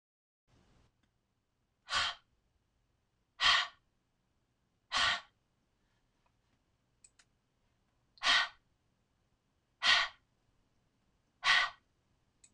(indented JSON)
{
  "exhalation_length": "12.5 s",
  "exhalation_amplitude": 7885,
  "exhalation_signal_mean_std_ratio": 0.27,
  "survey_phase": "beta (2021-08-13 to 2022-03-07)",
  "age": "65+",
  "gender": "Female",
  "wearing_mask": "No",
  "symptom_none": true,
  "smoker_status": "Ex-smoker",
  "respiratory_condition_asthma": false,
  "respiratory_condition_other": false,
  "recruitment_source": "REACT",
  "submission_delay": "5 days",
  "covid_test_result": "Negative",
  "covid_test_method": "RT-qPCR"
}